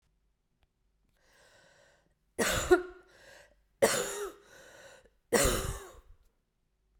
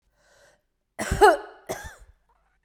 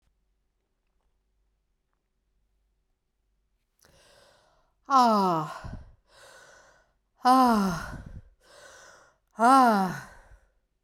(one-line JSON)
{"three_cough_length": "7.0 s", "three_cough_amplitude": 9723, "three_cough_signal_mean_std_ratio": 0.33, "cough_length": "2.6 s", "cough_amplitude": 21609, "cough_signal_mean_std_ratio": 0.28, "exhalation_length": "10.8 s", "exhalation_amplitude": 14674, "exhalation_signal_mean_std_ratio": 0.33, "survey_phase": "beta (2021-08-13 to 2022-03-07)", "age": "45-64", "gender": "Female", "wearing_mask": "No", "symptom_shortness_of_breath": true, "symptom_fatigue": true, "symptom_change_to_sense_of_smell_or_taste": true, "smoker_status": "Never smoked", "respiratory_condition_asthma": false, "respiratory_condition_other": false, "recruitment_source": "Test and Trace", "submission_delay": "2 days", "covid_test_result": "Positive", "covid_test_method": "RT-qPCR"}